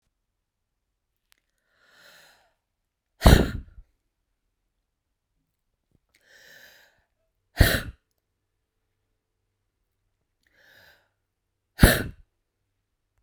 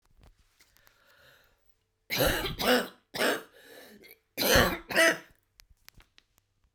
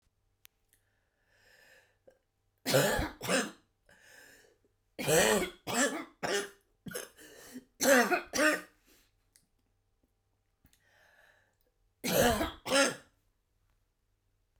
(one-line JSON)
{"exhalation_length": "13.2 s", "exhalation_amplitude": 32768, "exhalation_signal_mean_std_ratio": 0.16, "cough_length": "6.7 s", "cough_amplitude": 16203, "cough_signal_mean_std_ratio": 0.38, "three_cough_length": "14.6 s", "three_cough_amplitude": 10724, "three_cough_signal_mean_std_ratio": 0.37, "survey_phase": "beta (2021-08-13 to 2022-03-07)", "age": "45-64", "gender": "Female", "wearing_mask": "No", "symptom_cough_any": true, "symptom_onset": "11 days", "smoker_status": "Ex-smoker", "respiratory_condition_asthma": true, "respiratory_condition_other": false, "recruitment_source": "REACT", "submission_delay": "3 days", "covid_test_result": "Negative", "covid_test_method": "RT-qPCR"}